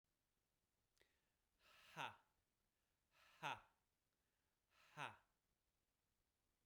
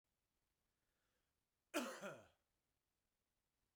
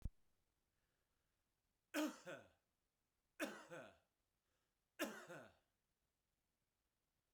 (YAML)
exhalation_length: 6.7 s
exhalation_amplitude: 711
exhalation_signal_mean_std_ratio: 0.24
cough_length: 3.8 s
cough_amplitude: 1134
cough_signal_mean_std_ratio: 0.25
three_cough_length: 7.3 s
three_cough_amplitude: 898
three_cough_signal_mean_std_ratio: 0.29
survey_phase: beta (2021-08-13 to 2022-03-07)
age: 45-64
gender: Male
wearing_mask: 'No'
symptom_cough_any: true
symptom_runny_or_blocked_nose: true
smoker_status: Ex-smoker
respiratory_condition_asthma: false
respiratory_condition_other: false
recruitment_source: REACT
submission_delay: 1 day
covid_test_result: Negative
covid_test_method: RT-qPCR
influenza_a_test_result: Negative
influenza_b_test_result: Negative